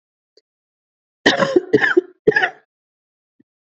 {
  "cough_length": "3.7 s",
  "cough_amplitude": 29894,
  "cough_signal_mean_std_ratio": 0.34,
  "survey_phase": "beta (2021-08-13 to 2022-03-07)",
  "age": "18-44",
  "gender": "Female",
  "wearing_mask": "No",
  "symptom_new_continuous_cough": true,
  "symptom_shortness_of_breath": true,
  "symptom_fatigue": true,
  "symptom_headache": true,
  "symptom_change_to_sense_of_smell_or_taste": true,
  "symptom_loss_of_taste": true,
  "symptom_onset": "4 days",
  "smoker_status": "Never smoked",
  "respiratory_condition_asthma": true,
  "respiratory_condition_other": false,
  "recruitment_source": "Test and Trace",
  "submission_delay": "2 days",
  "covid_test_result": "Positive",
  "covid_test_method": "RT-qPCR",
  "covid_ct_value": 18.9,
  "covid_ct_gene": "ORF1ab gene",
  "covid_ct_mean": 19.6,
  "covid_viral_load": "380000 copies/ml",
  "covid_viral_load_category": "Low viral load (10K-1M copies/ml)"
}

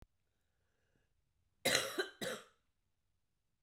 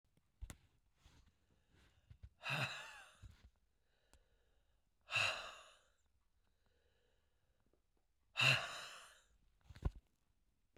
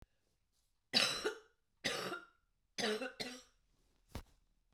{
  "cough_length": "3.6 s",
  "cough_amplitude": 7522,
  "cough_signal_mean_std_ratio": 0.29,
  "exhalation_length": "10.8 s",
  "exhalation_amplitude": 3269,
  "exhalation_signal_mean_std_ratio": 0.28,
  "three_cough_length": "4.7 s",
  "three_cough_amplitude": 5582,
  "three_cough_signal_mean_std_ratio": 0.39,
  "survey_phase": "beta (2021-08-13 to 2022-03-07)",
  "age": "65+",
  "gender": "Female",
  "wearing_mask": "No",
  "symptom_cough_any": true,
  "symptom_runny_or_blocked_nose": true,
  "symptom_sore_throat": true,
  "symptom_onset": "6 days",
  "smoker_status": "Ex-smoker",
  "respiratory_condition_asthma": false,
  "respiratory_condition_other": false,
  "recruitment_source": "Test and Trace",
  "submission_delay": "1 day",
  "covid_test_result": "Positive",
  "covid_test_method": "RT-qPCR",
  "covid_ct_value": 15.1,
  "covid_ct_gene": "N gene",
  "covid_ct_mean": 15.4,
  "covid_viral_load": "8700000 copies/ml",
  "covid_viral_load_category": "High viral load (>1M copies/ml)"
}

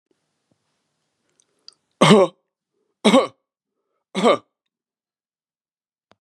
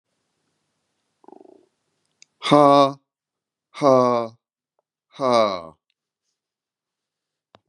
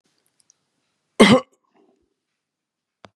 {
  "three_cough_length": "6.2 s",
  "three_cough_amplitude": 31937,
  "three_cough_signal_mean_std_ratio": 0.25,
  "exhalation_length": "7.7 s",
  "exhalation_amplitude": 32567,
  "exhalation_signal_mean_std_ratio": 0.29,
  "cough_length": "3.2 s",
  "cough_amplitude": 32767,
  "cough_signal_mean_std_ratio": 0.2,
  "survey_phase": "beta (2021-08-13 to 2022-03-07)",
  "age": "65+",
  "gender": "Male",
  "wearing_mask": "No",
  "symptom_none": true,
  "smoker_status": "Never smoked",
  "respiratory_condition_asthma": false,
  "respiratory_condition_other": false,
  "recruitment_source": "REACT",
  "submission_delay": "1 day",
  "covid_test_result": "Negative",
  "covid_test_method": "RT-qPCR",
  "influenza_a_test_result": "Negative",
  "influenza_b_test_result": "Negative"
}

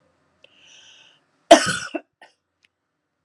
{
  "cough_length": "3.2 s",
  "cough_amplitude": 32768,
  "cough_signal_mean_std_ratio": 0.19,
  "survey_phase": "beta (2021-08-13 to 2022-03-07)",
  "age": "45-64",
  "gender": "Female",
  "wearing_mask": "No",
  "symptom_shortness_of_breath": true,
  "symptom_fatigue": true,
  "smoker_status": "Never smoked",
  "respiratory_condition_asthma": false,
  "respiratory_condition_other": false,
  "recruitment_source": "REACT",
  "submission_delay": "1 day",
  "covid_test_result": "Negative",
  "covid_test_method": "RT-qPCR",
  "influenza_a_test_result": "Negative",
  "influenza_b_test_result": "Negative"
}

